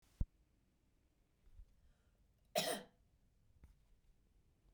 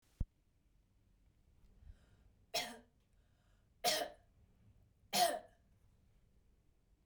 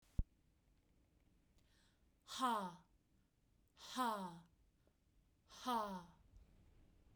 {"cough_length": "4.7 s", "cough_amplitude": 2017, "cough_signal_mean_std_ratio": 0.24, "three_cough_length": "7.1 s", "three_cough_amplitude": 3052, "three_cough_signal_mean_std_ratio": 0.28, "exhalation_length": "7.2 s", "exhalation_amplitude": 2009, "exhalation_signal_mean_std_ratio": 0.36, "survey_phase": "beta (2021-08-13 to 2022-03-07)", "age": "18-44", "gender": "Female", "wearing_mask": "No", "symptom_none": true, "smoker_status": "Never smoked", "respiratory_condition_asthma": false, "respiratory_condition_other": false, "recruitment_source": "REACT", "submission_delay": "0 days", "covid_test_result": "Negative", "covid_test_method": "RT-qPCR", "influenza_a_test_result": "Negative", "influenza_b_test_result": "Negative"}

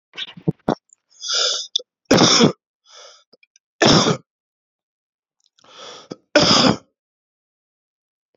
{"three_cough_length": "8.4 s", "three_cough_amplitude": 32671, "three_cough_signal_mean_std_ratio": 0.35, "survey_phase": "beta (2021-08-13 to 2022-03-07)", "age": "18-44", "gender": "Male", "wearing_mask": "No", "symptom_cough_any": true, "symptom_new_continuous_cough": true, "symptom_runny_or_blocked_nose": true, "symptom_shortness_of_breath": true, "symptom_fatigue": true, "symptom_headache": true, "symptom_onset": "2 days", "smoker_status": "Ex-smoker", "respiratory_condition_asthma": false, "respiratory_condition_other": false, "recruitment_source": "Test and Trace", "submission_delay": "1 day", "covid_test_result": "Positive", "covid_test_method": "RT-qPCR", "covid_ct_value": 20.5, "covid_ct_gene": "ORF1ab gene"}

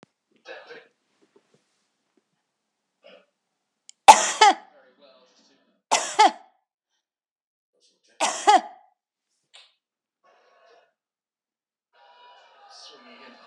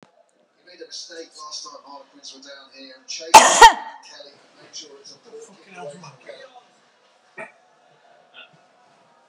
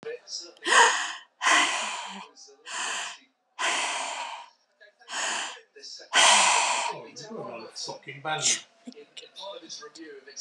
{"three_cough_length": "13.5 s", "three_cough_amplitude": 32768, "three_cough_signal_mean_std_ratio": 0.19, "cough_length": "9.3 s", "cough_amplitude": 32768, "cough_signal_mean_std_ratio": 0.2, "exhalation_length": "10.4 s", "exhalation_amplitude": 18258, "exhalation_signal_mean_std_ratio": 0.51, "survey_phase": "beta (2021-08-13 to 2022-03-07)", "age": "65+", "gender": "Female", "wearing_mask": "No", "symptom_none": true, "smoker_status": "Never smoked", "respiratory_condition_asthma": false, "respiratory_condition_other": false, "recruitment_source": "REACT", "submission_delay": "3 days", "covid_test_result": "Negative", "covid_test_method": "RT-qPCR", "influenza_a_test_result": "Unknown/Void", "influenza_b_test_result": "Unknown/Void"}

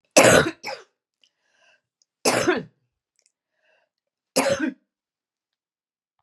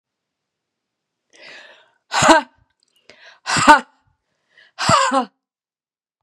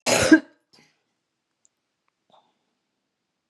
{"three_cough_length": "6.2 s", "three_cough_amplitude": 32768, "three_cough_signal_mean_std_ratio": 0.3, "exhalation_length": "6.2 s", "exhalation_amplitude": 32768, "exhalation_signal_mean_std_ratio": 0.3, "cough_length": "3.5 s", "cough_amplitude": 29542, "cough_signal_mean_std_ratio": 0.22, "survey_phase": "beta (2021-08-13 to 2022-03-07)", "age": "65+", "gender": "Female", "wearing_mask": "No", "symptom_cough_any": true, "symptom_runny_or_blocked_nose": true, "symptom_sore_throat": true, "symptom_onset": "6 days", "smoker_status": "Never smoked", "respiratory_condition_asthma": false, "respiratory_condition_other": false, "recruitment_source": "REACT", "submission_delay": "2 days", "covid_test_result": "Negative", "covid_test_method": "RT-qPCR", "influenza_a_test_result": "Negative", "influenza_b_test_result": "Negative"}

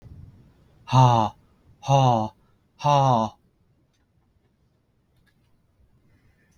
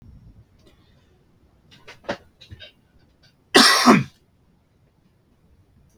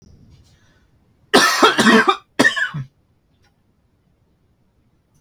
{"exhalation_length": "6.6 s", "exhalation_amplitude": 20551, "exhalation_signal_mean_std_ratio": 0.34, "cough_length": "6.0 s", "cough_amplitude": 32768, "cough_signal_mean_std_ratio": 0.25, "three_cough_length": "5.2 s", "three_cough_amplitude": 32768, "three_cough_signal_mean_std_ratio": 0.36, "survey_phase": "beta (2021-08-13 to 2022-03-07)", "age": "45-64", "gender": "Male", "wearing_mask": "No", "symptom_none": true, "smoker_status": "Never smoked", "respiratory_condition_asthma": false, "respiratory_condition_other": false, "recruitment_source": "REACT", "submission_delay": "2 days", "covid_test_result": "Negative", "covid_test_method": "RT-qPCR", "influenza_a_test_result": "Negative", "influenza_b_test_result": "Negative"}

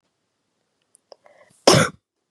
{"cough_length": "2.3 s", "cough_amplitude": 32381, "cough_signal_mean_std_ratio": 0.23, "survey_phase": "beta (2021-08-13 to 2022-03-07)", "age": "18-44", "gender": "Female", "wearing_mask": "No", "symptom_runny_or_blocked_nose": true, "symptom_fatigue": true, "symptom_onset": "3 days", "smoker_status": "Never smoked", "respiratory_condition_asthma": false, "respiratory_condition_other": false, "recruitment_source": "Test and Trace", "submission_delay": "2 days", "covid_test_result": "Positive", "covid_test_method": "RT-qPCR", "covid_ct_value": 19.5, "covid_ct_gene": "N gene", "covid_ct_mean": 19.8, "covid_viral_load": "320000 copies/ml", "covid_viral_load_category": "Low viral load (10K-1M copies/ml)"}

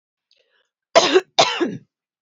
{"cough_length": "2.2 s", "cough_amplitude": 28639, "cough_signal_mean_std_ratio": 0.36, "survey_phase": "beta (2021-08-13 to 2022-03-07)", "age": "45-64", "gender": "Female", "wearing_mask": "No", "symptom_runny_or_blocked_nose": true, "smoker_status": "Ex-smoker", "respiratory_condition_asthma": false, "respiratory_condition_other": false, "recruitment_source": "REACT", "submission_delay": "0 days", "covid_test_result": "Negative", "covid_test_method": "RT-qPCR", "influenza_a_test_result": "Negative", "influenza_b_test_result": "Negative"}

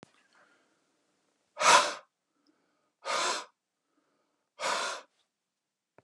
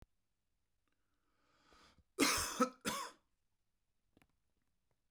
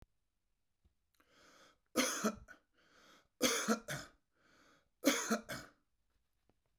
{"exhalation_length": "6.0 s", "exhalation_amplitude": 14882, "exhalation_signal_mean_std_ratio": 0.28, "cough_length": "5.1 s", "cough_amplitude": 3760, "cough_signal_mean_std_ratio": 0.28, "three_cough_length": "6.8 s", "three_cough_amplitude": 5102, "three_cough_signal_mean_std_ratio": 0.34, "survey_phase": "beta (2021-08-13 to 2022-03-07)", "age": "45-64", "gender": "Male", "wearing_mask": "No", "symptom_cough_any": true, "smoker_status": "Never smoked", "respiratory_condition_asthma": true, "respiratory_condition_other": false, "recruitment_source": "REACT", "submission_delay": "1 day", "covid_test_result": "Negative", "covid_test_method": "RT-qPCR"}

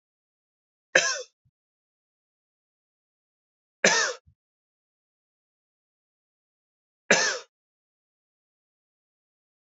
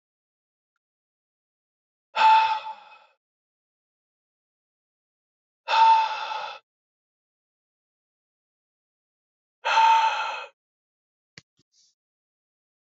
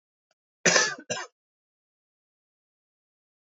{"three_cough_length": "9.7 s", "three_cough_amplitude": 26250, "three_cough_signal_mean_std_ratio": 0.2, "exhalation_length": "13.0 s", "exhalation_amplitude": 13717, "exhalation_signal_mean_std_ratio": 0.3, "cough_length": "3.6 s", "cough_amplitude": 20298, "cough_signal_mean_std_ratio": 0.24, "survey_phase": "alpha (2021-03-01 to 2021-08-12)", "age": "18-44", "gender": "Male", "wearing_mask": "No", "symptom_cough_any": true, "symptom_fatigue": true, "symptom_headache": true, "symptom_onset": "4 days", "smoker_status": "Never smoked", "respiratory_condition_asthma": false, "respiratory_condition_other": false, "recruitment_source": "Test and Trace", "submission_delay": "2 days", "covid_test_result": "Positive", "covid_test_method": "RT-qPCR", "covid_ct_value": 19.4, "covid_ct_gene": "ORF1ab gene"}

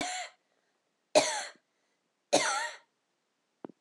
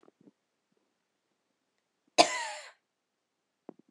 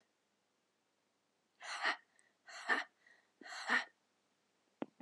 {"three_cough_length": "3.8 s", "three_cough_amplitude": 11396, "three_cough_signal_mean_std_ratio": 0.34, "cough_length": "3.9 s", "cough_amplitude": 19414, "cough_signal_mean_std_ratio": 0.17, "exhalation_length": "5.0 s", "exhalation_amplitude": 2798, "exhalation_signal_mean_std_ratio": 0.31, "survey_phase": "beta (2021-08-13 to 2022-03-07)", "age": "45-64", "gender": "Female", "wearing_mask": "No", "symptom_cough_any": true, "symptom_runny_or_blocked_nose": true, "symptom_fever_high_temperature": true, "symptom_change_to_sense_of_smell_or_taste": true, "symptom_onset": "3 days", "smoker_status": "Never smoked", "respiratory_condition_asthma": true, "respiratory_condition_other": false, "recruitment_source": "Test and Trace", "submission_delay": "2 days", "covid_test_result": "Positive", "covid_test_method": "RT-qPCR", "covid_ct_value": 17.3, "covid_ct_gene": "ORF1ab gene", "covid_ct_mean": 17.6, "covid_viral_load": "1700000 copies/ml", "covid_viral_load_category": "High viral load (>1M copies/ml)"}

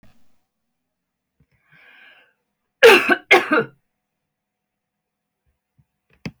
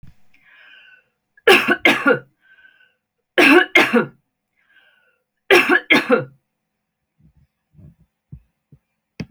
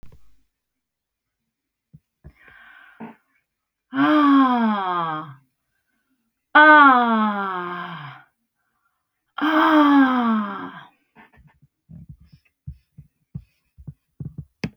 {"cough_length": "6.4 s", "cough_amplitude": 28946, "cough_signal_mean_std_ratio": 0.23, "three_cough_length": "9.3 s", "three_cough_amplitude": 31809, "three_cough_signal_mean_std_ratio": 0.34, "exhalation_length": "14.8 s", "exhalation_amplitude": 29416, "exhalation_signal_mean_std_ratio": 0.4, "survey_phase": "beta (2021-08-13 to 2022-03-07)", "age": "45-64", "gender": "Female", "wearing_mask": "No", "symptom_none": true, "smoker_status": "Never smoked", "respiratory_condition_asthma": false, "respiratory_condition_other": false, "recruitment_source": "REACT", "submission_delay": "1 day", "covid_test_result": "Negative", "covid_test_method": "RT-qPCR"}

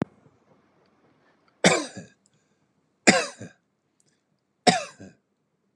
{"three_cough_length": "5.8 s", "three_cough_amplitude": 32662, "three_cough_signal_mean_std_ratio": 0.23, "survey_phase": "beta (2021-08-13 to 2022-03-07)", "age": "45-64", "gender": "Male", "wearing_mask": "No", "symptom_none": true, "smoker_status": "Never smoked", "respiratory_condition_asthma": false, "respiratory_condition_other": false, "recruitment_source": "REACT", "submission_delay": "1 day", "covid_test_result": "Negative", "covid_test_method": "RT-qPCR"}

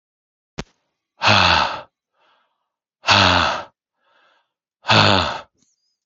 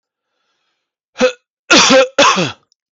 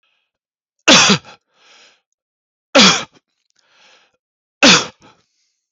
{"exhalation_length": "6.1 s", "exhalation_amplitude": 30510, "exhalation_signal_mean_std_ratio": 0.4, "cough_length": "3.0 s", "cough_amplitude": 32768, "cough_signal_mean_std_ratio": 0.44, "three_cough_length": "5.7 s", "three_cough_amplitude": 32768, "three_cough_signal_mean_std_ratio": 0.3, "survey_phase": "beta (2021-08-13 to 2022-03-07)", "age": "45-64", "gender": "Male", "wearing_mask": "No", "symptom_none": true, "smoker_status": "Never smoked", "respiratory_condition_asthma": false, "respiratory_condition_other": false, "recruitment_source": "REACT", "submission_delay": "1 day", "covid_test_result": "Negative", "covid_test_method": "RT-qPCR"}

